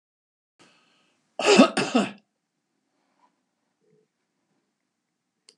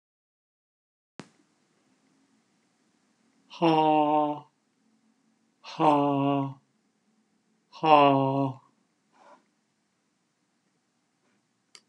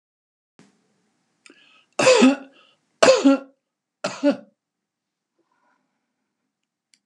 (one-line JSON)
{"cough_length": "5.6 s", "cough_amplitude": 24861, "cough_signal_mean_std_ratio": 0.23, "exhalation_length": "11.9 s", "exhalation_amplitude": 20264, "exhalation_signal_mean_std_ratio": 0.32, "three_cough_length": "7.1 s", "three_cough_amplitude": 31649, "three_cough_signal_mean_std_ratio": 0.28, "survey_phase": "beta (2021-08-13 to 2022-03-07)", "age": "65+", "gender": "Male", "wearing_mask": "No", "symptom_none": true, "smoker_status": "Ex-smoker", "respiratory_condition_asthma": false, "respiratory_condition_other": false, "recruitment_source": "REACT", "submission_delay": "1 day", "covid_test_result": "Negative", "covid_test_method": "RT-qPCR"}